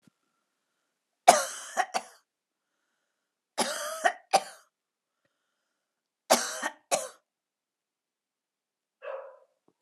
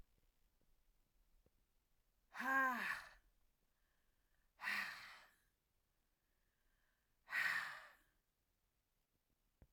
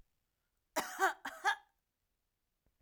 {
  "three_cough_length": "9.8 s",
  "three_cough_amplitude": 27013,
  "three_cough_signal_mean_std_ratio": 0.24,
  "exhalation_length": "9.7 s",
  "exhalation_amplitude": 1429,
  "exhalation_signal_mean_std_ratio": 0.32,
  "cough_length": "2.8 s",
  "cough_amplitude": 3512,
  "cough_signal_mean_std_ratio": 0.31,
  "survey_phase": "alpha (2021-03-01 to 2021-08-12)",
  "age": "45-64",
  "gender": "Female",
  "wearing_mask": "No",
  "symptom_none": true,
  "smoker_status": "Never smoked",
  "respiratory_condition_asthma": false,
  "respiratory_condition_other": false,
  "recruitment_source": "REACT",
  "submission_delay": "1 day",
  "covid_test_result": "Negative",
  "covid_test_method": "RT-qPCR"
}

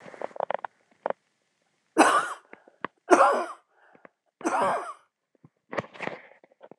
{
  "three_cough_length": "6.8 s",
  "three_cough_amplitude": 24027,
  "three_cough_signal_mean_std_ratio": 0.34,
  "survey_phase": "beta (2021-08-13 to 2022-03-07)",
  "age": "45-64",
  "gender": "Female",
  "wearing_mask": "No",
  "symptom_cough_any": true,
  "symptom_runny_or_blocked_nose": true,
  "symptom_shortness_of_breath": true,
  "symptom_fatigue": true,
  "symptom_change_to_sense_of_smell_or_taste": true,
  "symptom_onset": "12 days",
  "smoker_status": "Ex-smoker",
  "respiratory_condition_asthma": false,
  "respiratory_condition_other": false,
  "recruitment_source": "REACT",
  "submission_delay": "0 days",
  "covid_test_result": "Negative",
  "covid_test_method": "RT-qPCR"
}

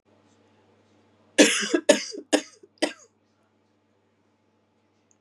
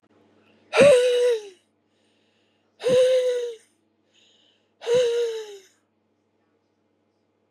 {
  "cough_length": "5.2 s",
  "cough_amplitude": 26812,
  "cough_signal_mean_std_ratio": 0.25,
  "exhalation_length": "7.5 s",
  "exhalation_amplitude": 20456,
  "exhalation_signal_mean_std_ratio": 0.44,
  "survey_phase": "beta (2021-08-13 to 2022-03-07)",
  "age": "45-64",
  "gender": "Female",
  "wearing_mask": "No",
  "symptom_cough_any": true,
  "symptom_runny_or_blocked_nose": true,
  "symptom_shortness_of_breath": true,
  "symptom_fatigue": true,
  "symptom_headache": true,
  "symptom_change_to_sense_of_smell_or_taste": true,
  "smoker_status": "Ex-smoker",
  "respiratory_condition_asthma": false,
  "respiratory_condition_other": false,
  "recruitment_source": "Test and Trace",
  "submission_delay": "2 days",
  "covid_test_result": "Positive",
  "covid_test_method": "RT-qPCR",
  "covid_ct_value": 20.2,
  "covid_ct_gene": "ORF1ab gene"
}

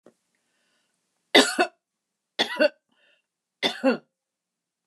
{
  "three_cough_length": "4.9 s",
  "three_cough_amplitude": 26632,
  "three_cough_signal_mean_std_ratio": 0.28,
  "survey_phase": "beta (2021-08-13 to 2022-03-07)",
  "age": "65+",
  "gender": "Female",
  "wearing_mask": "No",
  "symptom_none": true,
  "symptom_onset": "13 days",
  "smoker_status": "Never smoked",
  "respiratory_condition_asthma": false,
  "respiratory_condition_other": true,
  "recruitment_source": "REACT",
  "submission_delay": "0 days",
  "covid_test_result": "Negative",
  "covid_test_method": "RT-qPCR",
  "influenza_a_test_result": "Negative",
  "influenza_b_test_result": "Negative"
}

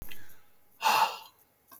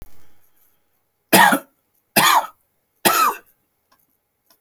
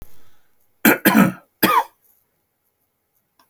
{
  "exhalation_length": "1.8 s",
  "exhalation_amplitude": 7284,
  "exhalation_signal_mean_std_ratio": 0.51,
  "three_cough_length": "4.6 s",
  "three_cough_amplitude": 32768,
  "three_cough_signal_mean_std_ratio": 0.36,
  "cough_length": "3.5 s",
  "cough_amplitude": 32335,
  "cough_signal_mean_std_ratio": 0.35,
  "survey_phase": "alpha (2021-03-01 to 2021-08-12)",
  "age": "65+",
  "gender": "Male",
  "wearing_mask": "No",
  "symptom_shortness_of_breath": true,
  "symptom_diarrhoea": true,
  "symptom_fatigue": true,
  "symptom_onset": "12 days",
  "smoker_status": "Ex-smoker",
  "respiratory_condition_asthma": false,
  "respiratory_condition_other": false,
  "recruitment_source": "REACT",
  "submission_delay": "2 days",
  "covid_test_result": "Negative",
  "covid_test_method": "RT-qPCR"
}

